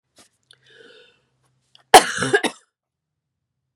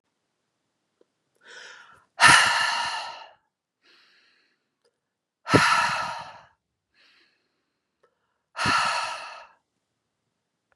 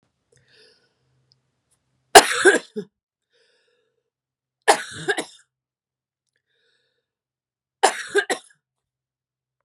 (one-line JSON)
{"cough_length": "3.8 s", "cough_amplitude": 32768, "cough_signal_mean_std_ratio": 0.2, "exhalation_length": "10.8 s", "exhalation_amplitude": 26949, "exhalation_signal_mean_std_ratio": 0.33, "three_cough_length": "9.6 s", "three_cough_amplitude": 32768, "three_cough_signal_mean_std_ratio": 0.2, "survey_phase": "beta (2021-08-13 to 2022-03-07)", "age": "45-64", "gender": "Female", "wearing_mask": "No", "symptom_cough_any": true, "symptom_runny_or_blocked_nose": true, "symptom_fatigue": true, "symptom_other": true, "symptom_onset": "4 days", "smoker_status": "Never smoked", "respiratory_condition_asthma": false, "respiratory_condition_other": false, "recruitment_source": "Test and Trace", "submission_delay": "1 day", "covid_test_result": "Positive", "covid_test_method": "RT-qPCR", "covid_ct_value": 26.2, "covid_ct_gene": "N gene"}